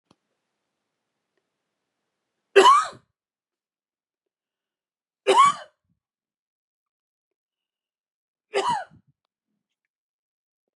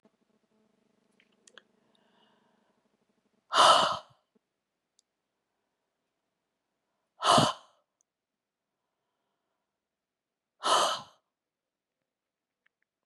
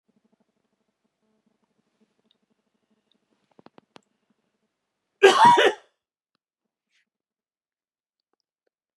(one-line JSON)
{"three_cough_length": "10.8 s", "three_cough_amplitude": 28180, "three_cough_signal_mean_std_ratio": 0.21, "exhalation_length": "13.1 s", "exhalation_amplitude": 12970, "exhalation_signal_mean_std_ratio": 0.22, "cough_length": "9.0 s", "cough_amplitude": 26869, "cough_signal_mean_std_ratio": 0.19, "survey_phase": "beta (2021-08-13 to 2022-03-07)", "age": "45-64", "gender": "Female", "wearing_mask": "No", "symptom_cough_any": true, "symptom_runny_or_blocked_nose": true, "symptom_fatigue": true, "symptom_headache": true, "symptom_onset": "2 days", "smoker_status": "Never smoked", "respiratory_condition_asthma": false, "respiratory_condition_other": false, "recruitment_source": "Test and Trace", "submission_delay": "1 day", "covid_test_result": "Positive", "covid_test_method": "RT-qPCR", "covid_ct_value": 19.7, "covid_ct_gene": "ORF1ab gene", "covid_ct_mean": 19.7, "covid_viral_load": "340000 copies/ml", "covid_viral_load_category": "Low viral load (10K-1M copies/ml)"}